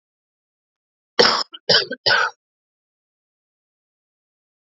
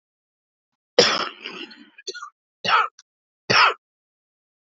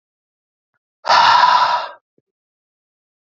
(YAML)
three_cough_length: 4.8 s
three_cough_amplitude: 32767
three_cough_signal_mean_std_ratio: 0.28
cough_length: 4.7 s
cough_amplitude: 29675
cough_signal_mean_std_ratio: 0.33
exhalation_length: 3.3 s
exhalation_amplitude: 29577
exhalation_signal_mean_std_ratio: 0.4
survey_phase: alpha (2021-03-01 to 2021-08-12)
age: 18-44
gender: Female
wearing_mask: 'No'
symptom_cough_any: true
symptom_headache: true
smoker_status: Current smoker (1 to 10 cigarettes per day)
respiratory_condition_asthma: false
respiratory_condition_other: false
recruitment_source: Test and Trace
submission_delay: 3 days
covid_test_result: Positive
covid_test_method: RT-qPCR
covid_ct_value: 28.3
covid_ct_gene: ORF1ab gene
covid_ct_mean: 28.5
covid_viral_load: 440 copies/ml
covid_viral_load_category: Minimal viral load (< 10K copies/ml)